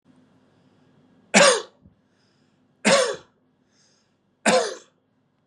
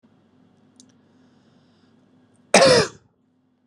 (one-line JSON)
{"three_cough_length": "5.5 s", "three_cough_amplitude": 29974, "three_cough_signal_mean_std_ratio": 0.3, "cough_length": "3.7 s", "cough_amplitude": 32767, "cough_signal_mean_std_ratio": 0.25, "survey_phase": "beta (2021-08-13 to 2022-03-07)", "age": "45-64", "gender": "Male", "wearing_mask": "No", "symptom_none": true, "smoker_status": "Never smoked", "respiratory_condition_asthma": false, "respiratory_condition_other": false, "recruitment_source": "REACT", "submission_delay": "2 days", "covid_test_result": "Negative", "covid_test_method": "RT-qPCR"}